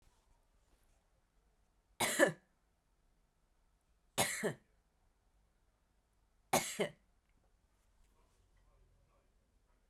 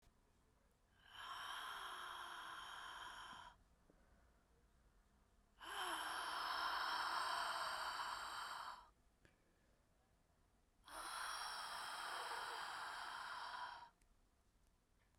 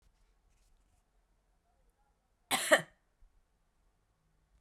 {"three_cough_length": "9.9 s", "three_cough_amplitude": 6643, "three_cough_signal_mean_std_ratio": 0.23, "exhalation_length": "15.2 s", "exhalation_amplitude": 808, "exhalation_signal_mean_std_ratio": 0.69, "cough_length": "4.6 s", "cough_amplitude": 9778, "cough_signal_mean_std_ratio": 0.17, "survey_phase": "beta (2021-08-13 to 2022-03-07)", "age": "18-44", "gender": "Female", "wearing_mask": "No", "symptom_cough_any": true, "symptom_runny_or_blocked_nose": true, "symptom_sore_throat": true, "symptom_fatigue": true, "symptom_other": true, "symptom_onset": "4 days", "smoker_status": "Ex-smoker", "respiratory_condition_asthma": false, "respiratory_condition_other": false, "recruitment_source": "Test and Trace", "submission_delay": "0 days", "covid_test_result": "Positive", "covid_test_method": "RT-qPCR", "covid_ct_value": 15.1, "covid_ct_gene": "S gene", "covid_ct_mean": 15.2, "covid_viral_load": "10000000 copies/ml", "covid_viral_load_category": "High viral load (>1M copies/ml)"}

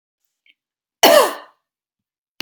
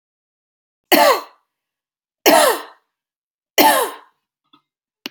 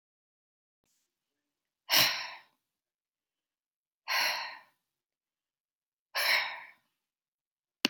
{"cough_length": "2.4 s", "cough_amplitude": 32768, "cough_signal_mean_std_ratio": 0.28, "three_cough_length": "5.1 s", "three_cough_amplitude": 32768, "three_cough_signal_mean_std_ratio": 0.34, "exhalation_length": "7.9 s", "exhalation_amplitude": 17499, "exhalation_signal_mean_std_ratio": 0.29, "survey_phase": "alpha (2021-03-01 to 2021-08-12)", "age": "18-44", "gender": "Female", "wearing_mask": "No", "symptom_none": true, "smoker_status": "Never smoked", "respiratory_condition_asthma": false, "respiratory_condition_other": false, "recruitment_source": "REACT", "submission_delay": "1 day", "covid_test_result": "Negative", "covid_test_method": "RT-qPCR"}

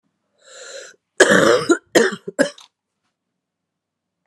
{"cough_length": "4.3 s", "cough_amplitude": 32768, "cough_signal_mean_std_ratio": 0.34, "survey_phase": "beta (2021-08-13 to 2022-03-07)", "age": "45-64", "gender": "Female", "wearing_mask": "No", "symptom_cough_any": true, "symptom_new_continuous_cough": true, "symptom_runny_or_blocked_nose": true, "symptom_fatigue": true, "symptom_fever_high_temperature": true, "symptom_headache": true, "symptom_change_to_sense_of_smell_or_taste": true, "symptom_loss_of_taste": true, "symptom_onset": "5 days", "smoker_status": "Never smoked", "respiratory_condition_asthma": false, "respiratory_condition_other": false, "recruitment_source": "Test and Trace", "submission_delay": "2 days", "covid_test_result": "Positive", "covid_test_method": "RT-qPCR", "covid_ct_value": 17.1, "covid_ct_gene": "ORF1ab gene", "covid_ct_mean": 17.6, "covid_viral_load": "1700000 copies/ml", "covid_viral_load_category": "High viral load (>1M copies/ml)"}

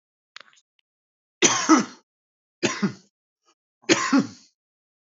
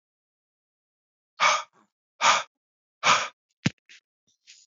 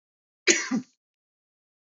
{"three_cough_length": "5.0 s", "three_cough_amplitude": 28262, "three_cough_signal_mean_std_ratio": 0.32, "exhalation_length": "4.7 s", "exhalation_amplitude": 15873, "exhalation_signal_mean_std_ratio": 0.29, "cough_length": "1.9 s", "cough_amplitude": 21617, "cough_signal_mean_std_ratio": 0.28, "survey_phase": "beta (2021-08-13 to 2022-03-07)", "age": "18-44", "gender": "Male", "wearing_mask": "No", "symptom_cough_any": true, "symptom_new_continuous_cough": true, "symptom_runny_or_blocked_nose": true, "symptom_sore_throat": true, "symptom_diarrhoea": true, "symptom_fatigue": true, "symptom_headache": true, "symptom_onset": "3 days", "smoker_status": "Never smoked", "respiratory_condition_asthma": false, "respiratory_condition_other": false, "recruitment_source": "Test and Trace", "submission_delay": "1 day", "covid_test_result": "Negative", "covid_test_method": "RT-qPCR"}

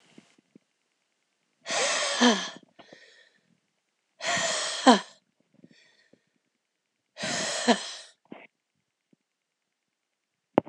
{"exhalation_length": "10.7 s", "exhalation_amplitude": 24470, "exhalation_signal_mean_std_ratio": 0.31, "survey_phase": "alpha (2021-03-01 to 2021-08-12)", "age": "45-64", "gender": "Female", "wearing_mask": "No", "symptom_cough_any": true, "symptom_fatigue": true, "symptom_headache": true, "symptom_onset": "4 days", "smoker_status": "Ex-smoker", "respiratory_condition_asthma": false, "respiratory_condition_other": false, "recruitment_source": "Test and Trace", "submission_delay": "2 days", "covid_test_result": "Positive", "covid_test_method": "RT-qPCR", "covid_ct_value": 23.2, "covid_ct_gene": "ORF1ab gene"}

